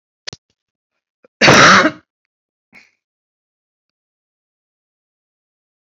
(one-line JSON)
{"cough_length": "6.0 s", "cough_amplitude": 32500, "cough_signal_mean_std_ratio": 0.24, "survey_phase": "beta (2021-08-13 to 2022-03-07)", "age": "65+", "gender": "Female", "wearing_mask": "No", "symptom_none": true, "smoker_status": "Current smoker (11 or more cigarettes per day)", "respiratory_condition_asthma": false, "respiratory_condition_other": false, "recruitment_source": "REACT", "submission_delay": "2 days", "covid_test_result": "Negative", "covid_test_method": "RT-qPCR", "influenza_a_test_result": "Negative", "influenza_b_test_result": "Negative"}